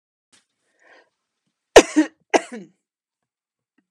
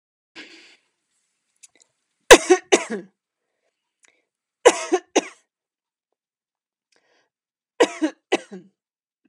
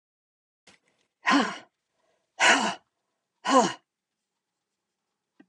{"cough_length": "3.9 s", "cough_amplitude": 32768, "cough_signal_mean_std_ratio": 0.17, "three_cough_length": "9.3 s", "three_cough_amplitude": 32768, "three_cough_signal_mean_std_ratio": 0.19, "exhalation_length": "5.5 s", "exhalation_amplitude": 17930, "exhalation_signal_mean_std_ratio": 0.3, "survey_phase": "alpha (2021-03-01 to 2021-08-12)", "age": "65+", "gender": "Female", "wearing_mask": "No", "symptom_none": true, "smoker_status": "Never smoked", "respiratory_condition_asthma": false, "respiratory_condition_other": false, "recruitment_source": "REACT", "submission_delay": "32 days", "covid_test_result": "Negative", "covid_test_method": "RT-qPCR"}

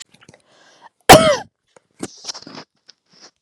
{"cough_length": "3.4 s", "cough_amplitude": 32768, "cough_signal_mean_std_ratio": 0.24, "survey_phase": "beta (2021-08-13 to 2022-03-07)", "age": "18-44", "gender": "Female", "wearing_mask": "No", "symptom_none": true, "smoker_status": "Never smoked", "respiratory_condition_asthma": false, "respiratory_condition_other": false, "recruitment_source": "REACT", "submission_delay": "1 day", "covid_test_result": "Negative", "covid_test_method": "RT-qPCR", "influenza_a_test_result": "Negative", "influenza_b_test_result": "Negative"}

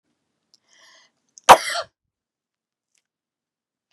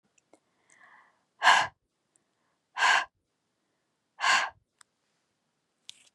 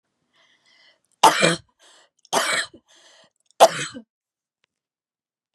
{"cough_length": "3.9 s", "cough_amplitude": 32768, "cough_signal_mean_std_ratio": 0.14, "exhalation_length": "6.1 s", "exhalation_amplitude": 15888, "exhalation_signal_mean_std_ratio": 0.27, "three_cough_length": "5.5 s", "three_cough_amplitude": 32367, "three_cough_signal_mean_std_ratio": 0.26, "survey_phase": "beta (2021-08-13 to 2022-03-07)", "age": "18-44", "gender": "Female", "wearing_mask": "No", "symptom_fatigue": true, "symptom_headache": true, "symptom_onset": "5 days", "smoker_status": "Never smoked", "respiratory_condition_asthma": false, "respiratory_condition_other": false, "recruitment_source": "REACT", "submission_delay": "1 day", "covid_test_result": "Negative", "covid_test_method": "RT-qPCR", "influenza_a_test_result": "Negative", "influenza_b_test_result": "Negative"}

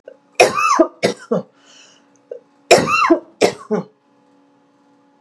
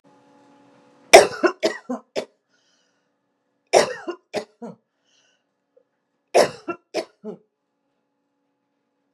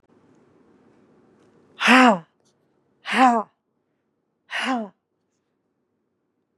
{"cough_length": "5.2 s", "cough_amplitude": 32768, "cough_signal_mean_std_ratio": 0.4, "three_cough_length": "9.1 s", "three_cough_amplitude": 32768, "three_cough_signal_mean_std_ratio": 0.22, "exhalation_length": "6.6 s", "exhalation_amplitude": 26271, "exhalation_signal_mean_std_ratio": 0.28, "survey_phase": "beta (2021-08-13 to 2022-03-07)", "age": "45-64", "gender": "Female", "wearing_mask": "Yes", "symptom_sore_throat": true, "symptom_fatigue": true, "symptom_headache": true, "smoker_status": "Never smoked", "respiratory_condition_asthma": false, "respiratory_condition_other": false, "recruitment_source": "Test and Trace", "submission_delay": "2 days", "covid_test_result": "Positive", "covid_test_method": "RT-qPCR", "covid_ct_value": 31.3, "covid_ct_gene": "N gene"}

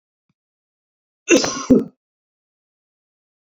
{"cough_length": "3.5 s", "cough_amplitude": 27610, "cough_signal_mean_std_ratio": 0.25, "survey_phase": "beta (2021-08-13 to 2022-03-07)", "age": "65+", "gender": "Male", "wearing_mask": "No", "symptom_none": true, "smoker_status": "Ex-smoker", "respiratory_condition_asthma": false, "respiratory_condition_other": false, "recruitment_source": "REACT", "submission_delay": "2 days", "covid_test_result": "Negative", "covid_test_method": "RT-qPCR"}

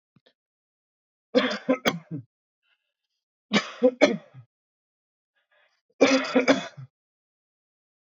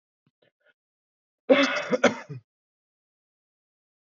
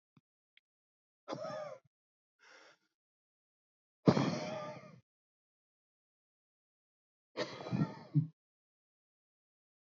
{"three_cough_length": "8.0 s", "three_cough_amplitude": 23265, "three_cough_signal_mean_std_ratio": 0.31, "cough_length": "4.0 s", "cough_amplitude": 19981, "cough_signal_mean_std_ratio": 0.27, "exhalation_length": "9.8 s", "exhalation_amplitude": 9531, "exhalation_signal_mean_std_ratio": 0.26, "survey_phase": "alpha (2021-03-01 to 2021-08-12)", "age": "18-44", "gender": "Male", "wearing_mask": "No", "symptom_none": true, "smoker_status": "Ex-smoker", "respiratory_condition_asthma": true, "respiratory_condition_other": false, "recruitment_source": "REACT", "submission_delay": "2 days", "covid_test_result": "Negative", "covid_test_method": "RT-qPCR"}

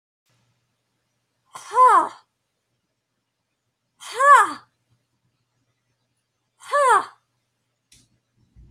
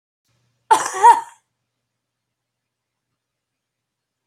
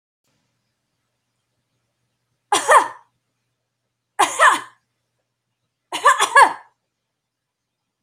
{"exhalation_length": "8.7 s", "exhalation_amplitude": 24722, "exhalation_signal_mean_std_ratio": 0.27, "cough_length": "4.3 s", "cough_amplitude": 28567, "cough_signal_mean_std_ratio": 0.21, "three_cough_length": "8.0 s", "three_cough_amplitude": 30079, "three_cough_signal_mean_std_ratio": 0.27, "survey_phase": "beta (2021-08-13 to 2022-03-07)", "age": "65+", "gender": "Female", "wearing_mask": "No", "symptom_runny_or_blocked_nose": true, "symptom_sore_throat": true, "symptom_headache": true, "symptom_loss_of_taste": true, "symptom_onset": "12 days", "smoker_status": "Ex-smoker", "respiratory_condition_asthma": false, "respiratory_condition_other": false, "recruitment_source": "REACT", "submission_delay": "1 day", "covid_test_result": "Negative", "covid_test_method": "RT-qPCR"}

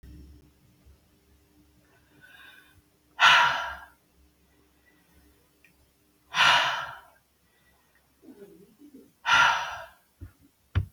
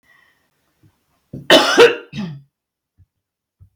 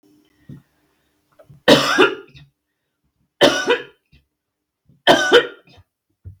{"exhalation_length": "10.9 s", "exhalation_amplitude": 17907, "exhalation_signal_mean_std_ratio": 0.31, "cough_length": "3.8 s", "cough_amplitude": 32768, "cough_signal_mean_std_ratio": 0.29, "three_cough_length": "6.4 s", "three_cough_amplitude": 32768, "three_cough_signal_mean_std_ratio": 0.33, "survey_phase": "beta (2021-08-13 to 2022-03-07)", "age": "45-64", "gender": "Female", "wearing_mask": "No", "symptom_none": true, "smoker_status": "Never smoked", "respiratory_condition_asthma": false, "respiratory_condition_other": false, "recruitment_source": "REACT", "submission_delay": "2 days", "covid_test_result": "Negative", "covid_test_method": "RT-qPCR", "influenza_a_test_result": "Negative", "influenza_b_test_result": "Negative"}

